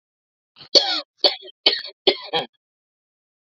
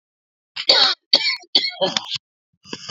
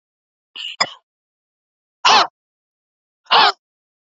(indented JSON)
{
  "three_cough_length": "3.4 s",
  "three_cough_amplitude": 30857,
  "three_cough_signal_mean_std_ratio": 0.31,
  "cough_length": "2.9 s",
  "cough_amplitude": 32768,
  "cough_signal_mean_std_ratio": 0.43,
  "exhalation_length": "4.2 s",
  "exhalation_amplitude": 29845,
  "exhalation_signal_mean_std_ratio": 0.28,
  "survey_phase": "beta (2021-08-13 to 2022-03-07)",
  "age": "45-64",
  "gender": "Female",
  "wearing_mask": "No",
  "symptom_none": true,
  "smoker_status": "Never smoked",
  "respiratory_condition_asthma": true,
  "respiratory_condition_other": false,
  "recruitment_source": "REACT",
  "submission_delay": "1 day",
  "covid_test_result": "Negative",
  "covid_test_method": "RT-qPCR",
  "influenza_a_test_result": "Negative",
  "influenza_b_test_result": "Negative"
}